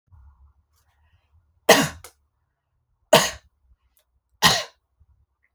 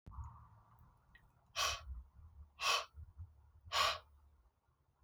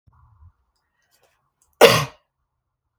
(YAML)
three_cough_length: 5.5 s
three_cough_amplitude: 32000
three_cough_signal_mean_std_ratio: 0.23
exhalation_length: 5.0 s
exhalation_amplitude: 3175
exhalation_signal_mean_std_ratio: 0.4
cough_length: 3.0 s
cough_amplitude: 30053
cough_signal_mean_std_ratio: 0.2
survey_phase: alpha (2021-03-01 to 2021-08-12)
age: 18-44
gender: Female
wearing_mask: 'No'
symptom_none: true
smoker_status: Never smoked
respiratory_condition_asthma: false
respiratory_condition_other: false
recruitment_source: REACT
submission_delay: 2 days
covid_test_result: Negative
covid_test_method: RT-qPCR